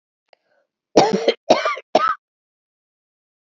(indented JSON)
{
  "cough_length": "3.5 s",
  "cough_amplitude": 32768,
  "cough_signal_mean_std_ratio": 0.34,
  "survey_phase": "beta (2021-08-13 to 2022-03-07)",
  "age": "45-64",
  "gender": "Female",
  "wearing_mask": "No",
  "symptom_none": true,
  "smoker_status": "Never smoked",
  "respiratory_condition_asthma": false,
  "respiratory_condition_other": false,
  "recruitment_source": "REACT",
  "submission_delay": "1 day",
  "covid_test_result": "Negative",
  "covid_test_method": "RT-qPCR"
}